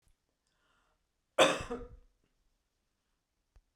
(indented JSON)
{
  "cough_length": "3.8 s",
  "cough_amplitude": 10920,
  "cough_signal_mean_std_ratio": 0.21,
  "survey_phase": "beta (2021-08-13 to 2022-03-07)",
  "age": "45-64",
  "gender": "Female",
  "wearing_mask": "No",
  "symptom_none": true,
  "smoker_status": "Never smoked",
  "respiratory_condition_asthma": false,
  "respiratory_condition_other": false,
  "recruitment_source": "REACT",
  "submission_delay": "1 day",
  "covid_test_result": "Negative",
  "covid_test_method": "RT-qPCR"
}